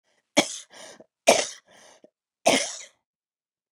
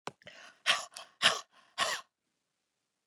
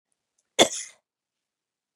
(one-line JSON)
{"three_cough_length": "3.7 s", "three_cough_amplitude": 25076, "three_cough_signal_mean_std_ratio": 0.28, "exhalation_length": "3.1 s", "exhalation_amplitude": 13006, "exhalation_signal_mean_std_ratio": 0.31, "cough_length": "2.0 s", "cough_amplitude": 28188, "cough_signal_mean_std_ratio": 0.18, "survey_phase": "beta (2021-08-13 to 2022-03-07)", "age": "45-64", "gender": "Female", "wearing_mask": "No", "symptom_cough_any": true, "symptom_runny_or_blocked_nose": true, "symptom_shortness_of_breath": true, "symptom_abdominal_pain": true, "symptom_fatigue": true, "symptom_fever_high_temperature": true, "symptom_headache": true, "symptom_change_to_sense_of_smell_or_taste": true, "symptom_onset": "3 days", "smoker_status": "Never smoked", "respiratory_condition_asthma": true, "respiratory_condition_other": false, "recruitment_source": "Test and Trace", "submission_delay": "2 days", "covid_test_result": "Positive", "covid_test_method": "RT-qPCR", "covid_ct_value": 20.6, "covid_ct_gene": "S gene", "covid_ct_mean": 21.0, "covid_viral_load": "130000 copies/ml", "covid_viral_load_category": "Low viral load (10K-1M copies/ml)"}